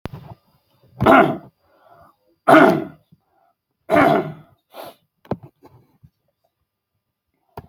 {"three_cough_length": "7.7 s", "three_cough_amplitude": 32768, "three_cough_signal_mean_std_ratio": 0.3, "survey_phase": "beta (2021-08-13 to 2022-03-07)", "age": "65+", "gender": "Male", "wearing_mask": "No", "symptom_abdominal_pain": true, "smoker_status": "Ex-smoker", "respiratory_condition_asthma": false, "respiratory_condition_other": false, "recruitment_source": "REACT", "submission_delay": "8 days", "covid_test_result": "Negative", "covid_test_method": "RT-qPCR", "influenza_a_test_result": "Negative", "influenza_b_test_result": "Negative"}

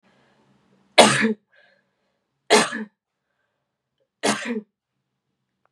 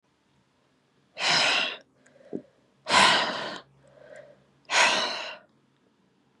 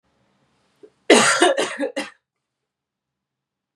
{"three_cough_length": "5.7 s", "three_cough_amplitude": 32767, "three_cough_signal_mean_std_ratio": 0.27, "exhalation_length": "6.4 s", "exhalation_amplitude": 17301, "exhalation_signal_mean_std_ratio": 0.42, "cough_length": "3.8 s", "cough_amplitude": 32693, "cough_signal_mean_std_ratio": 0.33, "survey_phase": "beta (2021-08-13 to 2022-03-07)", "age": "18-44", "gender": "Female", "wearing_mask": "No", "symptom_cough_any": true, "symptom_runny_or_blocked_nose": true, "symptom_shortness_of_breath": true, "symptom_sore_throat": true, "symptom_diarrhoea": true, "symptom_fatigue": true, "symptom_fever_high_temperature": true, "symptom_headache": true, "smoker_status": "Current smoker (1 to 10 cigarettes per day)", "respiratory_condition_asthma": false, "respiratory_condition_other": false, "recruitment_source": "Test and Trace", "submission_delay": "1 day", "covid_test_result": "Positive", "covid_test_method": "LFT"}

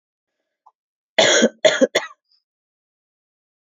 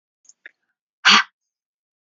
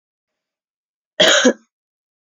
{"three_cough_length": "3.7 s", "three_cough_amplitude": 29181, "three_cough_signal_mean_std_ratio": 0.3, "exhalation_length": "2.0 s", "exhalation_amplitude": 28369, "exhalation_signal_mean_std_ratio": 0.23, "cough_length": "2.2 s", "cough_amplitude": 30791, "cough_signal_mean_std_ratio": 0.31, "survey_phase": "beta (2021-08-13 to 2022-03-07)", "age": "18-44", "gender": "Female", "wearing_mask": "No", "symptom_sore_throat": true, "symptom_onset": "4 days", "smoker_status": "Never smoked", "respiratory_condition_asthma": false, "respiratory_condition_other": false, "recruitment_source": "REACT", "submission_delay": "1 day", "covid_test_result": "Negative", "covid_test_method": "RT-qPCR"}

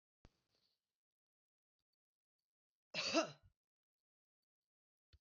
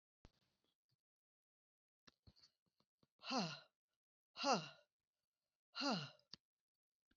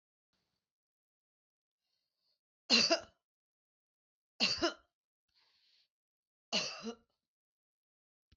{"cough_length": "5.2 s", "cough_amplitude": 2674, "cough_signal_mean_std_ratio": 0.19, "exhalation_length": "7.2 s", "exhalation_amplitude": 2186, "exhalation_signal_mean_std_ratio": 0.27, "three_cough_length": "8.4 s", "three_cough_amplitude": 5402, "three_cough_signal_mean_std_ratio": 0.23, "survey_phase": "beta (2021-08-13 to 2022-03-07)", "age": "65+", "gender": "Female", "wearing_mask": "No", "symptom_runny_or_blocked_nose": true, "smoker_status": "Never smoked", "respiratory_condition_asthma": false, "respiratory_condition_other": false, "recruitment_source": "REACT", "submission_delay": "2 days", "covid_test_result": "Negative", "covid_test_method": "RT-qPCR", "influenza_a_test_result": "Negative", "influenza_b_test_result": "Negative"}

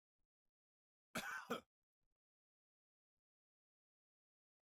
{"cough_length": "4.7 s", "cough_amplitude": 797, "cough_signal_mean_std_ratio": 0.21, "survey_phase": "beta (2021-08-13 to 2022-03-07)", "age": "45-64", "gender": "Male", "wearing_mask": "No", "symptom_none": true, "smoker_status": "Ex-smoker", "respiratory_condition_asthma": false, "respiratory_condition_other": false, "recruitment_source": "REACT", "submission_delay": "2 days", "covid_test_result": "Negative", "covid_test_method": "RT-qPCR", "influenza_a_test_result": "Negative", "influenza_b_test_result": "Negative"}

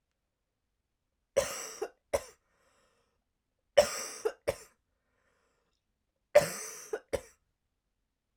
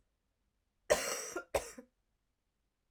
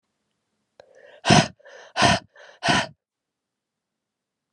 {"three_cough_length": "8.4 s", "three_cough_amplitude": 13653, "three_cough_signal_mean_std_ratio": 0.23, "cough_length": "2.9 s", "cough_amplitude": 6329, "cough_signal_mean_std_ratio": 0.3, "exhalation_length": "4.5 s", "exhalation_amplitude": 28206, "exhalation_signal_mean_std_ratio": 0.29, "survey_phase": "alpha (2021-03-01 to 2021-08-12)", "age": "18-44", "gender": "Female", "wearing_mask": "No", "symptom_cough_any": true, "symptom_new_continuous_cough": true, "symptom_shortness_of_breath": true, "symptom_headache": true, "symptom_onset": "3 days", "smoker_status": "Never smoked", "respiratory_condition_asthma": false, "respiratory_condition_other": false, "recruitment_source": "Test and Trace", "submission_delay": "1 day", "covid_test_result": "Positive", "covid_test_method": "RT-qPCR", "covid_ct_value": 27.4, "covid_ct_gene": "ORF1ab gene", "covid_ct_mean": 28.0, "covid_viral_load": "650 copies/ml", "covid_viral_load_category": "Minimal viral load (< 10K copies/ml)"}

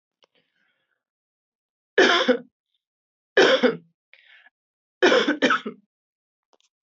{"three_cough_length": "6.8 s", "three_cough_amplitude": 19074, "three_cough_signal_mean_std_ratio": 0.34, "survey_phase": "beta (2021-08-13 to 2022-03-07)", "age": "18-44", "gender": "Female", "wearing_mask": "No", "symptom_cough_any": true, "symptom_runny_or_blocked_nose": true, "symptom_sore_throat": true, "symptom_fatigue": true, "symptom_headache": true, "smoker_status": "Never smoked", "respiratory_condition_asthma": false, "respiratory_condition_other": false, "recruitment_source": "Test and Trace", "submission_delay": "2 days", "covid_test_result": "Positive", "covid_test_method": "RT-qPCR"}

